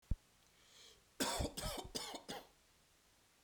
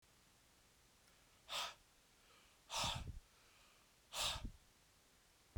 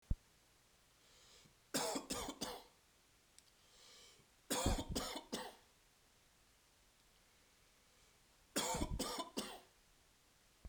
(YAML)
cough_length: 3.4 s
cough_amplitude: 2193
cough_signal_mean_std_ratio: 0.44
exhalation_length: 5.6 s
exhalation_amplitude: 1115
exhalation_signal_mean_std_ratio: 0.42
three_cough_length: 10.7 s
three_cough_amplitude: 2196
three_cough_signal_mean_std_ratio: 0.41
survey_phase: beta (2021-08-13 to 2022-03-07)
age: 18-44
gender: Male
wearing_mask: 'No'
symptom_cough_any: true
symptom_runny_or_blocked_nose: true
symptom_fatigue: true
symptom_headache: true
smoker_status: Never smoked
respiratory_condition_asthma: false
respiratory_condition_other: false
recruitment_source: Test and Trace
submission_delay: 2 days
covid_test_result: Positive
covid_test_method: LFT